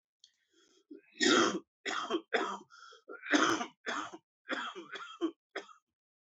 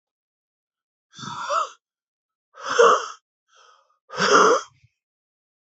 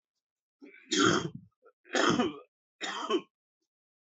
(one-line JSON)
{"cough_length": "6.2 s", "cough_amplitude": 7128, "cough_signal_mean_std_ratio": 0.44, "exhalation_length": "5.7 s", "exhalation_amplitude": 25866, "exhalation_signal_mean_std_ratio": 0.34, "three_cough_length": "4.2 s", "three_cough_amplitude": 9131, "three_cough_signal_mean_std_ratio": 0.41, "survey_phase": "beta (2021-08-13 to 2022-03-07)", "age": "45-64", "gender": "Male", "wearing_mask": "No", "symptom_new_continuous_cough": true, "symptom_runny_or_blocked_nose": true, "symptom_shortness_of_breath": true, "symptom_onset": "5 days", "smoker_status": "Never smoked", "respiratory_condition_asthma": false, "respiratory_condition_other": false, "recruitment_source": "Test and Trace", "submission_delay": "1 day", "covid_test_result": "Positive", "covid_test_method": "RT-qPCR", "covid_ct_value": 18.9, "covid_ct_gene": "ORF1ab gene", "covid_ct_mean": 20.2, "covid_viral_load": "240000 copies/ml", "covid_viral_load_category": "Low viral load (10K-1M copies/ml)"}